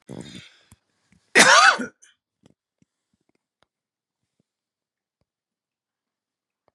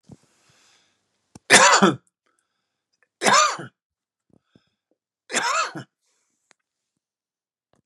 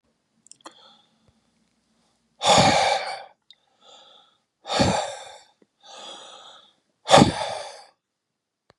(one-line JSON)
{"cough_length": "6.7 s", "cough_amplitude": 32768, "cough_signal_mean_std_ratio": 0.21, "three_cough_length": "7.9 s", "three_cough_amplitude": 32768, "three_cough_signal_mean_std_ratio": 0.28, "exhalation_length": "8.8 s", "exhalation_amplitude": 32767, "exhalation_signal_mean_std_ratio": 0.32, "survey_phase": "beta (2021-08-13 to 2022-03-07)", "age": "45-64", "gender": "Male", "wearing_mask": "No", "symptom_none": true, "smoker_status": "Ex-smoker", "respiratory_condition_asthma": false, "respiratory_condition_other": false, "recruitment_source": "REACT", "submission_delay": "2 days", "covid_test_result": "Negative", "covid_test_method": "RT-qPCR", "influenza_a_test_result": "Negative", "influenza_b_test_result": "Negative"}